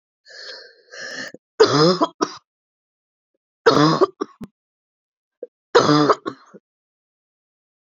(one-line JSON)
{"three_cough_length": "7.9 s", "three_cough_amplitude": 28794, "three_cough_signal_mean_std_ratio": 0.33, "survey_phase": "beta (2021-08-13 to 2022-03-07)", "age": "45-64", "gender": "Female", "wearing_mask": "No", "symptom_cough_any": true, "symptom_runny_or_blocked_nose": true, "symptom_sore_throat": true, "symptom_fatigue": true, "symptom_headache": true, "symptom_other": true, "smoker_status": "Never smoked", "respiratory_condition_asthma": false, "respiratory_condition_other": false, "recruitment_source": "Test and Trace", "submission_delay": "2 days", "covid_test_result": "Positive", "covid_test_method": "LAMP"}